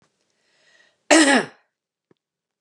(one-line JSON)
{"cough_length": "2.6 s", "cough_amplitude": 30006, "cough_signal_mean_std_ratio": 0.29, "survey_phase": "beta (2021-08-13 to 2022-03-07)", "age": "45-64", "gender": "Female", "wearing_mask": "No", "symptom_none": true, "smoker_status": "Never smoked", "respiratory_condition_asthma": false, "respiratory_condition_other": false, "recruitment_source": "Test and Trace", "submission_delay": "1 day", "covid_test_result": "Negative", "covid_test_method": "RT-qPCR"}